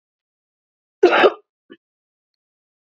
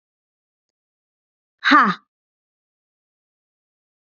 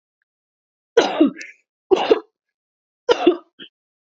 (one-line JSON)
{"cough_length": "2.8 s", "cough_amplitude": 27578, "cough_signal_mean_std_ratio": 0.25, "exhalation_length": "4.0 s", "exhalation_amplitude": 27878, "exhalation_signal_mean_std_ratio": 0.21, "three_cough_length": "4.0 s", "three_cough_amplitude": 28115, "three_cough_signal_mean_std_ratio": 0.33, "survey_phase": "beta (2021-08-13 to 2022-03-07)", "age": "18-44", "gender": "Female", "wearing_mask": "No", "symptom_none": true, "smoker_status": "Never smoked", "respiratory_condition_asthma": false, "respiratory_condition_other": false, "recruitment_source": "REACT", "submission_delay": "3 days", "covid_test_result": "Negative", "covid_test_method": "RT-qPCR", "influenza_a_test_result": "Negative", "influenza_b_test_result": "Negative"}